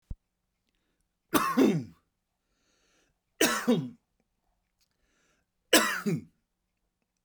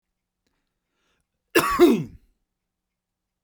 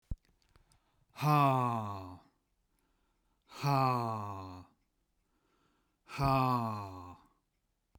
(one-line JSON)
{"three_cough_length": "7.2 s", "three_cough_amplitude": 16782, "three_cough_signal_mean_std_ratio": 0.32, "cough_length": "3.4 s", "cough_amplitude": 23286, "cough_signal_mean_std_ratio": 0.28, "exhalation_length": "8.0 s", "exhalation_amplitude": 4918, "exhalation_signal_mean_std_ratio": 0.45, "survey_phase": "beta (2021-08-13 to 2022-03-07)", "age": "45-64", "gender": "Male", "wearing_mask": "No", "symptom_none": true, "smoker_status": "Ex-smoker", "respiratory_condition_asthma": false, "respiratory_condition_other": false, "recruitment_source": "REACT", "submission_delay": "2 days", "covid_test_result": "Negative", "covid_test_method": "RT-qPCR"}